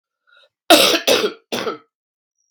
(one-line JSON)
{"cough_length": "2.5 s", "cough_amplitude": 32768, "cough_signal_mean_std_ratio": 0.4, "survey_phase": "beta (2021-08-13 to 2022-03-07)", "age": "45-64", "gender": "Female", "wearing_mask": "No", "symptom_cough_any": true, "symptom_runny_or_blocked_nose": true, "symptom_headache": true, "symptom_change_to_sense_of_smell_or_taste": true, "symptom_loss_of_taste": true, "symptom_onset": "4 days", "smoker_status": "Never smoked", "respiratory_condition_asthma": false, "respiratory_condition_other": false, "recruitment_source": "Test and Trace", "submission_delay": "2 days", "covid_test_result": "Positive", "covid_test_method": "RT-qPCR", "covid_ct_value": 19.6, "covid_ct_gene": "ORF1ab gene", "covid_ct_mean": 19.9, "covid_viral_load": "290000 copies/ml", "covid_viral_load_category": "Low viral load (10K-1M copies/ml)"}